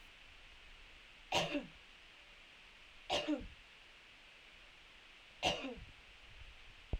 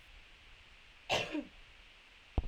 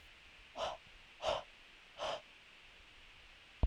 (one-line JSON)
{"three_cough_length": "7.0 s", "three_cough_amplitude": 3897, "three_cough_signal_mean_std_ratio": 0.45, "cough_length": "2.5 s", "cough_amplitude": 4424, "cough_signal_mean_std_ratio": 0.41, "exhalation_length": "3.7 s", "exhalation_amplitude": 3450, "exhalation_signal_mean_std_ratio": 0.41, "survey_phase": "alpha (2021-03-01 to 2021-08-12)", "age": "18-44", "gender": "Female", "wearing_mask": "No", "symptom_none": true, "smoker_status": "Never smoked", "respiratory_condition_asthma": false, "respiratory_condition_other": false, "recruitment_source": "REACT", "submission_delay": "1 day", "covid_test_result": "Negative", "covid_test_method": "RT-qPCR"}